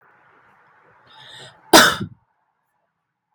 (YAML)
cough_length: 3.3 s
cough_amplitude: 32768
cough_signal_mean_std_ratio: 0.22
survey_phase: beta (2021-08-13 to 2022-03-07)
age: 18-44
gender: Female
wearing_mask: 'No'
symptom_none: true
smoker_status: Never smoked
respiratory_condition_asthma: false
respiratory_condition_other: false
recruitment_source: Test and Trace
submission_delay: 1 day
covid_test_result: Positive
covid_test_method: RT-qPCR
covid_ct_value: 26.3
covid_ct_gene: ORF1ab gene